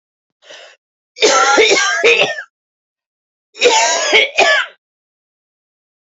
{"cough_length": "6.1 s", "cough_amplitude": 31166, "cough_signal_mean_std_ratio": 0.51, "survey_phase": "beta (2021-08-13 to 2022-03-07)", "age": "45-64", "gender": "Female", "wearing_mask": "No", "symptom_cough_any": true, "symptom_runny_or_blocked_nose": true, "symptom_shortness_of_breath": true, "symptom_fatigue": true, "symptom_headache": true, "symptom_change_to_sense_of_smell_or_taste": true, "symptom_loss_of_taste": true, "symptom_onset": "4 days", "smoker_status": "Current smoker (11 or more cigarettes per day)", "respiratory_condition_asthma": false, "respiratory_condition_other": false, "recruitment_source": "Test and Trace", "submission_delay": "2 days", "covid_test_result": "Positive", "covid_test_method": "RT-qPCR", "covid_ct_value": 14.0, "covid_ct_gene": "ORF1ab gene", "covid_ct_mean": 14.4, "covid_viral_load": "19000000 copies/ml", "covid_viral_load_category": "High viral load (>1M copies/ml)"}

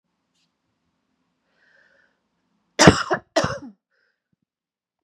{"cough_length": "5.0 s", "cough_amplitude": 32768, "cough_signal_mean_std_ratio": 0.2, "survey_phase": "beta (2021-08-13 to 2022-03-07)", "age": "45-64", "gender": "Female", "wearing_mask": "No", "symptom_cough_any": true, "symptom_runny_or_blocked_nose": true, "symptom_fatigue": true, "symptom_headache": true, "symptom_onset": "3 days", "smoker_status": "Never smoked", "respiratory_condition_asthma": false, "respiratory_condition_other": false, "recruitment_source": "Test and Trace", "submission_delay": "2 days", "covid_test_result": "Positive", "covid_test_method": "RT-qPCR", "covid_ct_value": 19.1, "covid_ct_gene": "ORF1ab gene", "covid_ct_mean": 19.7, "covid_viral_load": "330000 copies/ml", "covid_viral_load_category": "Low viral load (10K-1M copies/ml)"}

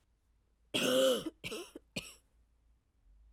{"three_cough_length": "3.3 s", "three_cough_amplitude": 3889, "three_cough_signal_mean_std_ratio": 0.39, "survey_phase": "alpha (2021-03-01 to 2021-08-12)", "age": "18-44", "gender": "Female", "wearing_mask": "No", "symptom_cough_any": true, "symptom_new_continuous_cough": true, "symptom_shortness_of_breath": true, "symptom_fatigue": true, "symptom_headache": true, "symptom_change_to_sense_of_smell_or_taste": true, "symptom_loss_of_taste": true, "symptom_onset": "6 days", "smoker_status": "Never smoked", "respiratory_condition_asthma": false, "respiratory_condition_other": false, "recruitment_source": "Test and Trace", "submission_delay": "2 days", "covid_test_result": "Positive", "covid_test_method": "RT-qPCR", "covid_ct_value": 16.2, "covid_ct_gene": "ORF1ab gene", "covid_ct_mean": 17.3, "covid_viral_load": "2100000 copies/ml", "covid_viral_load_category": "High viral load (>1M copies/ml)"}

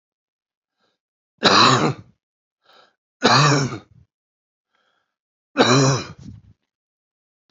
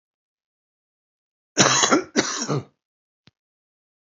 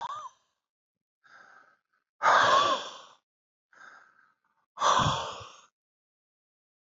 {"three_cough_length": "7.5 s", "three_cough_amplitude": 29074, "three_cough_signal_mean_std_ratio": 0.36, "cough_length": "4.0 s", "cough_amplitude": 28019, "cough_signal_mean_std_ratio": 0.34, "exhalation_length": "6.8 s", "exhalation_amplitude": 10156, "exhalation_signal_mean_std_ratio": 0.35, "survey_phase": "beta (2021-08-13 to 2022-03-07)", "age": "65+", "gender": "Male", "wearing_mask": "No", "symptom_cough_any": true, "symptom_new_continuous_cough": true, "symptom_runny_or_blocked_nose": true, "smoker_status": "Never smoked", "respiratory_condition_asthma": false, "respiratory_condition_other": false, "recruitment_source": "Test and Trace", "submission_delay": "2 days", "covid_test_result": "Positive", "covid_test_method": "RT-qPCR", "covid_ct_value": 17.7, "covid_ct_gene": "ORF1ab gene", "covid_ct_mean": 18.6, "covid_viral_load": "790000 copies/ml", "covid_viral_load_category": "Low viral load (10K-1M copies/ml)"}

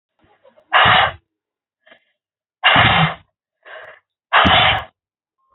{"exhalation_length": "5.5 s", "exhalation_amplitude": 30236, "exhalation_signal_mean_std_ratio": 0.42, "survey_phase": "beta (2021-08-13 to 2022-03-07)", "age": "45-64", "gender": "Female", "wearing_mask": "No", "symptom_cough_any": true, "smoker_status": "Never smoked", "respiratory_condition_asthma": false, "respiratory_condition_other": false, "recruitment_source": "Test and Trace", "submission_delay": "0 days", "covid_test_result": "Negative", "covid_test_method": "LFT"}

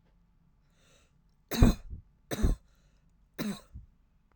{"three_cough_length": "4.4 s", "three_cough_amplitude": 15934, "three_cough_signal_mean_std_ratio": 0.27, "survey_phase": "alpha (2021-03-01 to 2021-08-12)", "age": "18-44", "gender": "Female", "wearing_mask": "No", "symptom_fatigue": true, "symptom_onset": "13 days", "smoker_status": "Never smoked", "respiratory_condition_asthma": true, "respiratory_condition_other": false, "recruitment_source": "REACT", "submission_delay": "1 day", "covid_test_result": "Negative", "covid_test_method": "RT-qPCR"}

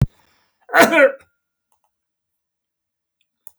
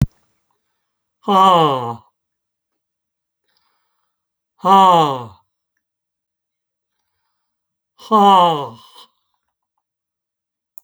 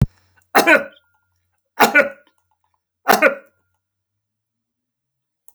{"cough_length": "3.6 s", "cough_amplitude": 32767, "cough_signal_mean_std_ratio": 0.27, "exhalation_length": "10.8 s", "exhalation_amplitude": 29677, "exhalation_signal_mean_std_ratio": 0.32, "three_cough_length": "5.5 s", "three_cough_amplitude": 32768, "three_cough_signal_mean_std_ratio": 0.29, "survey_phase": "beta (2021-08-13 to 2022-03-07)", "age": "65+", "gender": "Male", "wearing_mask": "No", "symptom_none": true, "symptom_onset": "12 days", "smoker_status": "Ex-smoker", "respiratory_condition_asthma": false, "respiratory_condition_other": true, "recruitment_source": "REACT", "submission_delay": "1 day", "covid_test_result": "Negative", "covid_test_method": "RT-qPCR", "influenza_a_test_result": "Negative", "influenza_b_test_result": "Negative"}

